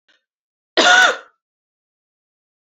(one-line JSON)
{"cough_length": "2.7 s", "cough_amplitude": 29223, "cough_signal_mean_std_ratio": 0.31, "survey_phase": "alpha (2021-03-01 to 2021-08-12)", "age": "18-44", "gender": "Female", "wearing_mask": "No", "symptom_none": true, "smoker_status": "Current smoker (1 to 10 cigarettes per day)", "respiratory_condition_asthma": true, "respiratory_condition_other": false, "recruitment_source": "Test and Trace", "submission_delay": "2 days", "covid_test_result": "Positive", "covid_test_method": "RT-qPCR", "covid_ct_value": 20.7, "covid_ct_gene": "N gene", "covid_ct_mean": 21.4, "covid_viral_load": "96000 copies/ml", "covid_viral_load_category": "Low viral load (10K-1M copies/ml)"}